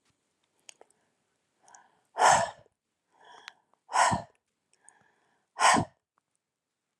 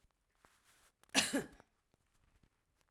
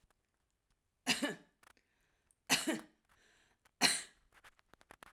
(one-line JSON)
{"exhalation_length": "7.0 s", "exhalation_amplitude": 12710, "exhalation_signal_mean_std_ratio": 0.27, "cough_length": "2.9 s", "cough_amplitude": 5638, "cough_signal_mean_std_ratio": 0.24, "three_cough_length": "5.1 s", "three_cough_amplitude": 7247, "three_cough_signal_mean_std_ratio": 0.28, "survey_phase": "alpha (2021-03-01 to 2021-08-12)", "age": "45-64", "gender": "Female", "wearing_mask": "No", "symptom_none": true, "symptom_onset": "12 days", "smoker_status": "Ex-smoker", "respiratory_condition_asthma": false, "respiratory_condition_other": false, "recruitment_source": "REACT", "submission_delay": "1 day", "covid_test_result": "Negative", "covid_test_method": "RT-qPCR"}